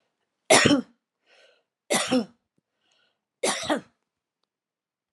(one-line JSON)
{"three_cough_length": "5.1 s", "three_cough_amplitude": 26923, "three_cough_signal_mean_std_ratio": 0.31, "survey_phase": "alpha (2021-03-01 to 2021-08-12)", "age": "45-64", "gender": "Female", "wearing_mask": "No", "symptom_none": true, "smoker_status": "Ex-smoker", "respiratory_condition_asthma": false, "respiratory_condition_other": false, "recruitment_source": "REACT", "submission_delay": "1 day", "covid_test_result": "Negative", "covid_test_method": "RT-qPCR"}